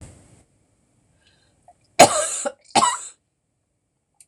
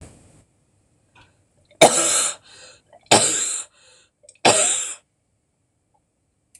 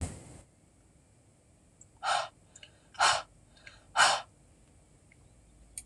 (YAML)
cough_length: 4.3 s
cough_amplitude: 26028
cough_signal_mean_std_ratio: 0.26
three_cough_length: 6.6 s
three_cough_amplitude: 26028
three_cough_signal_mean_std_ratio: 0.34
exhalation_length: 5.9 s
exhalation_amplitude: 9996
exhalation_signal_mean_std_ratio: 0.31
survey_phase: beta (2021-08-13 to 2022-03-07)
age: 65+
gender: Female
wearing_mask: 'No'
symptom_cough_any: true
symptom_runny_or_blocked_nose: true
symptom_sore_throat: true
symptom_onset: 3 days
smoker_status: Never smoked
respiratory_condition_asthma: false
respiratory_condition_other: false
recruitment_source: Test and Trace
submission_delay: 1 day
covid_test_result: Positive
covid_test_method: RT-qPCR
covid_ct_value: 22.1
covid_ct_gene: ORF1ab gene